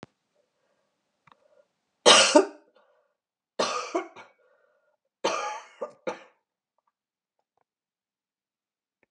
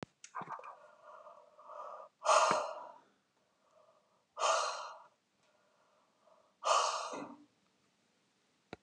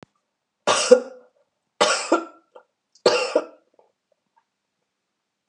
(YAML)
three_cough_length: 9.1 s
three_cough_amplitude: 30564
three_cough_signal_mean_std_ratio: 0.23
exhalation_length: 8.8 s
exhalation_amplitude: 6372
exhalation_signal_mean_std_ratio: 0.36
cough_length: 5.5 s
cough_amplitude: 31659
cough_signal_mean_std_ratio: 0.3
survey_phase: beta (2021-08-13 to 2022-03-07)
age: 65+
gender: Female
wearing_mask: 'No'
symptom_runny_or_blocked_nose: true
symptom_fatigue: true
symptom_headache: true
symptom_onset: 4 days
smoker_status: Never smoked
respiratory_condition_asthma: false
respiratory_condition_other: false
recruitment_source: Test and Trace
submission_delay: 1 day
covid_test_result: Positive
covid_test_method: RT-qPCR
covid_ct_value: 27.2
covid_ct_gene: ORF1ab gene
covid_ct_mean: 27.7
covid_viral_load: 850 copies/ml
covid_viral_load_category: Minimal viral load (< 10K copies/ml)